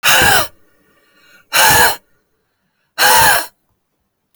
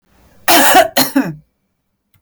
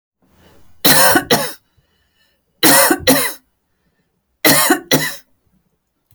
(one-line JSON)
{"exhalation_length": "4.4 s", "exhalation_amplitude": 32768, "exhalation_signal_mean_std_ratio": 0.47, "cough_length": "2.2 s", "cough_amplitude": 32768, "cough_signal_mean_std_ratio": 0.46, "three_cough_length": "6.1 s", "three_cough_amplitude": 32768, "three_cough_signal_mean_std_ratio": 0.43, "survey_phase": "beta (2021-08-13 to 2022-03-07)", "age": "45-64", "gender": "Female", "wearing_mask": "No", "symptom_none": true, "smoker_status": "Never smoked", "respiratory_condition_asthma": false, "respiratory_condition_other": false, "recruitment_source": "REACT", "submission_delay": "0 days", "covid_test_result": "Negative", "covid_test_method": "RT-qPCR", "influenza_a_test_result": "Unknown/Void", "influenza_b_test_result": "Unknown/Void"}